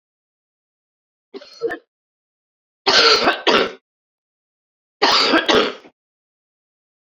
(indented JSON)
{
  "three_cough_length": "7.2 s",
  "three_cough_amplitude": 32767,
  "three_cough_signal_mean_std_ratio": 0.37,
  "survey_phase": "beta (2021-08-13 to 2022-03-07)",
  "age": "45-64",
  "gender": "Female",
  "wearing_mask": "No",
  "symptom_cough_any": true,
  "symptom_new_continuous_cough": true,
  "symptom_runny_or_blocked_nose": true,
  "symptom_sore_throat": true,
  "symptom_fatigue": true,
  "symptom_change_to_sense_of_smell_or_taste": true,
  "symptom_onset": "4 days",
  "smoker_status": "Never smoked",
  "respiratory_condition_asthma": false,
  "respiratory_condition_other": false,
  "recruitment_source": "Test and Trace",
  "submission_delay": "2 days",
  "covid_test_result": "Positive",
  "covid_test_method": "ePCR"
}